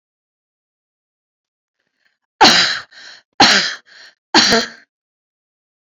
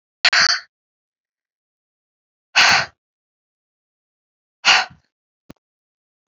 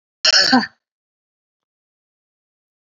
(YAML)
three_cough_length: 5.8 s
three_cough_amplitude: 32768
three_cough_signal_mean_std_ratio: 0.33
exhalation_length: 6.3 s
exhalation_amplitude: 31050
exhalation_signal_mean_std_ratio: 0.27
cough_length: 2.8 s
cough_amplitude: 30573
cough_signal_mean_std_ratio: 0.29
survey_phase: beta (2021-08-13 to 2022-03-07)
age: 45-64
gender: Female
wearing_mask: 'No'
symptom_none: true
smoker_status: Never smoked
respiratory_condition_asthma: false
respiratory_condition_other: false
recruitment_source: REACT
submission_delay: 1 day
covid_test_method: RT-qPCR